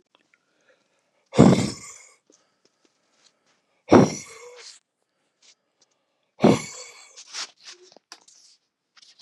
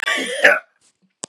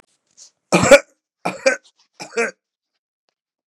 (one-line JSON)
{"exhalation_length": "9.2 s", "exhalation_amplitude": 32428, "exhalation_signal_mean_std_ratio": 0.23, "cough_length": "1.3 s", "cough_amplitude": 32768, "cough_signal_mean_std_ratio": 0.45, "three_cough_length": "3.7 s", "three_cough_amplitude": 32768, "three_cough_signal_mean_std_ratio": 0.27, "survey_phase": "beta (2021-08-13 to 2022-03-07)", "age": "45-64", "gender": "Male", "wearing_mask": "No", "symptom_runny_or_blocked_nose": true, "symptom_onset": "3 days", "smoker_status": "Ex-smoker", "respiratory_condition_asthma": false, "respiratory_condition_other": false, "recruitment_source": "Test and Trace", "submission_delay": "2 days", "covid_test_result": "Positive", "covid_test_method": "RT-qPCR", "covid_ct_value": 15.5, "covid_ct_gene": "ORF1ab gene", "covid_ct_mean": 15.8, "covid_viral_load": "6500000 copies/ml", "covid_viral_load_category": "High viral load (>1M copies/ml)"}